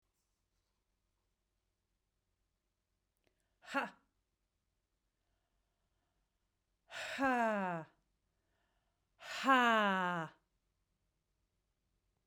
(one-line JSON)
{"exhalation_length": "12.3 s", "exhalation_amplitude": 5225, "exhalation_signal_mean_std_ratio": 0.29, "survey_phase": "beta (2021-08-13 to 2022-03-07)", "age": "45-64", "gender": "Female", "wearing_mask": "No", "symptom_cough_any": true, "symptom_runny_or_blocked_nose": true, "symptom_fatigue": true, "symptom_headache": true, "symptom_change_to_sense_of_smell_or_taste": true, "symptom_loss_of_taste": true, "symptom_other": true, "symptom_onset": "2 days", "smoker_status": "Never smoked", "respiratory_condition_asthma": false, "respiratory_condition_other": false, "recruitment_source": "Test and Trace", "submission_delay": "2 days", "covid_test_result": "Positive", "covid_test_method": "RT-qPCR"}